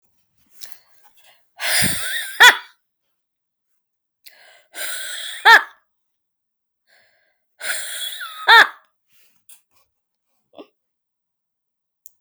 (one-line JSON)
{"exhalation_length": "12.2 s", "exhalation_amplitude": 32768, "exhalation_signal_mean_std_ratio": 0.26, "survey_phase": "alpha (2021-03-01 to 2021-08-12)", "age": "45-64", "gender": "Female", "wearing_mask": "No", "symptom_none": true, "smoker_status": "Never smoked", "respiratory_condition_asthma": false, "respiratory_condition_other": false, "recruitment_source": "REACT", "submission_delay": "2 days", "covid_test_result": "Negative", "covid_test_method": "RT-qPCR"}